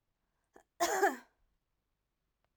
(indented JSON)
{
  "cough_length": "2.6 s",
  "cough_amplitude": 5282,
  "cough_signal_mean_std_ratio": 0.28,
  "survey_phase": "beta (2021-08-13 to 2022-03-07)",
  "age": "45-64",
  "gender": "Female",
  "wearing_mask": "No",
  "symptom_other": true,
  "smoker_status": "Never smoked",
  "respiratory_condition_asthma": false,
  "respiratory_condition_other": false,
  "recruitment_source": "Test and Trace",
  "submission_delay": "2 days",
  "covid_test_result": "Positive",
  "covid_test_method": "RT-qPCR",
  "covid_ct_value": 37.0,
  "covid_ct_gene": "N gene"
}